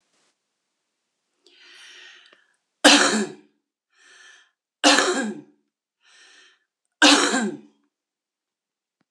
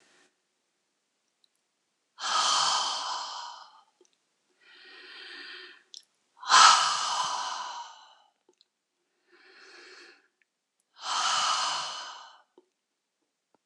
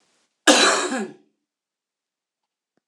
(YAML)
three_cough_length: 9.1 s
three_cough_amplitude: 26028
three_cough_signal_mean_std_ratio: 0.3
exhalation_length: 13.7 s
exhalation_amplitude: 22235
exhalation_signal_mean_std_ratio: 0.36
cough_length: 2.9 s
cough_amplitude: 26028
cough_signal_mean_std_ratio: 0.33
survey_phase: beta (2021-08-13 to 2022-03-07)
age: 65+
gender: Female
wearing_mask: 'No'
symptom_none: true
smoker_status: Current smoker (11 or more cigarettes per day)
respiratory_condition_asthma: true
respiratory_condition_other: false
recruitment_source: REACT
submission_delay: 0 days
covid_test_result: Negative
covid_test_method: RT-qPCR
influenza_a_test_result: Negative
influenza_b_test_result: Negative